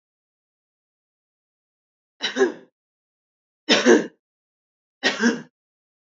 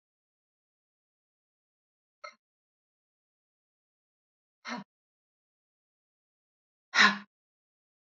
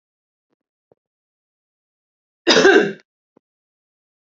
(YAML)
three_cough_length: 6.1 s
three_cough_amplitude: 25464
three_cough_signal_mean_std_ratio: 0.28
exhalation_length: 8.2 s
exhalation_amplitude: 13219
exhalation_signal_mean_std_ratio: 0.13
cough_length: 4.4 s
cough_amplitude: 30938
cough_signal_mean_std_ratio: 0.25
survey_phase: alpha (2021-03-01 to 2021-08-12)
age: 45-64
gender: Female
wearing_mask: 'No'
symptom_none: true
smoker_status: Ex-smoker
respiratory_condition_asthma: false
respiratory_condition_other: false
recruitment_source: REACT
submission_delay: 1 day
covid_test_result: Negative
covid_test_method: RT-qPCR